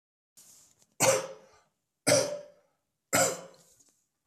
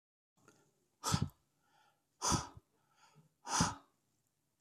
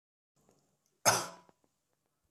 {"three_cough_length": "4.3 s", "three_cough_amplitude": 12801, "three_cough_signal_mean_std_ratio": 0.35, "exhalation_length": "4.6 s", "exhalation_amplitude": 4046, "exhalation_signal_mean_std_ratio": 0.31, "cough_length": "2.3 s", "cough_amplitude": 8379, "cough_signal_mean_std_ratio": 0.22, "survey_phase": "beta (2021-08-13 to 2022-03-07)", "age": "45-64", "gender": "Male", "wearing_mask": "No", "symptom_none": true, "smoker_status": "Never smoked", "respiratory_condition_asthma": false, "respiratory_condition_other": false, "recruitment_source": "REACT", "submission_delay": "2 days", "covid_test_result": "Negative", "covid_test_method": "RT-qPCR", "influenza_a_test_result": "Negative", "influenza_b_test_result": "Negative"}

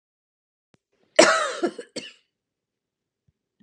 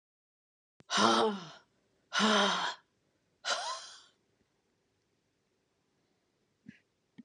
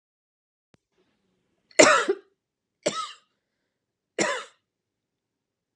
{"cough_length": "3.6 s", "cough_amplitude": 31565, "cough_signal_mean_std_ratio": 0.25, "exhalation_length": "7.2 s", "exhalation_amplitude": 8365, "exhalation_signal_mean_std_ratio": 0.35, "three_cough_length": "5.8 s", "three_cough_amplitude": 30535, "three_cough_signal_mean_std_ratio": 0.23, "survey_phase": "beta (2021-08-13 to 2022-03-07)", "age": "45-64", "gender": "Female", "wearing_mask": "No", "symptom_runny_or_blocked_nose": true, "symptom_shortness_of_breath": true, "symptom_fatigue": true, "symptom_onset": "8 days", "smoker_status": "Never smoked", "respiratory_condition_asthma": false, "respiratory_condition_other": false, "recruitment_source": "REACT", "submission_delay": "2 days", "covid_test_result": "Negative", "covid_test_method": "RT-qPCR", "influenza_a_test_result": "Negative", "influenza_b_test_result": "Negative"}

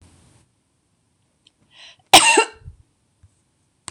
{"cough_length": "3.9 s", "cough_amplitude": 26028, "cough_signal_mean_std_ratio": 0.22, "survey_phase": "beta (2021-08-13 to 2022-03-07)", "age": "45-64", "gender": "Female", "wearing_mask": "No", "symptom_none": true, "smoker_status": "Never smoked", "respiratory_condition_asthma": true, "respiratory_condition_other": false, "recruitment_source": "REACT", "submission_delay": "1 day", "covid_test_result": "Negative", "covid_test_method": "RT-qPCR", "influenza_a_test_result": "Negative", "influenza_b_test_result": "Negative"}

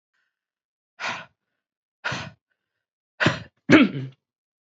{"exhalation_length": "4.7 s", "exhalation_amplitude": 28557, "exhalation_signal_mean_std_ratio": 0.26, "survey_phase": "beta (2021-08-13 to 2022-03-07)", "age": "45-64", "gender": "Female", "wearing_mask": "No", "symptom_cough_any": true, "symptom_runny_or_blocked_nose": true, "symptom_fatigue": true, "smoker_status": "Current smoker (11 or more cigarettes per day)", "recruitment_source": "Test and Trace", "submission_delay": "2 days", "covid_test_result": "Positive", "covid_test_method": "RT-qPCR", "covid_ct_value": 19.6, "covid_ct_gene": "ORF1ab gene", "covid_ct_mean": 20.0, "covid_viral_load": "270000 copies/ml", "covid_viral_load_category": "Low viral load (10K-1M copies/ml)"}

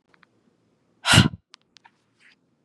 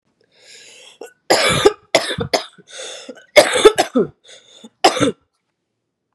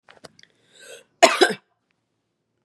{"exhalation_length": "2.6 s", "exhalation_amplitude": 31867, "exhalation_signal_mean_std_ratio": 0.22, "three_cough_length": "6.1 s", "three_cough_amplitude": 32768, "three_cough_signal_mean_std_ratio": 0.37, "cough_length": "2.6 s", "cough_amplitude": 32670, "cough_signal_mean_std_ratio": 0.23, "survey_phase": "beta (2021-08-13 to 2022-03-07)", "age": "18-44", "gender": "Female", "wearing_mask": "No", "symptom_cough_any": true, "symptom_runny_or_blocked_nose": true, "symptom_sore_throat": true, "symptom_fatigue": true, "symptom_headache": true, "smoker_status": "Never smoked", "respiratory_condition_asthma": false, "respiratory_condition_other": false, "recruitment_source": "Test and Trace", "submission_delay": "2 days", "covid_test_result": "Positive", "covid_test_method": "RT-qPCR"}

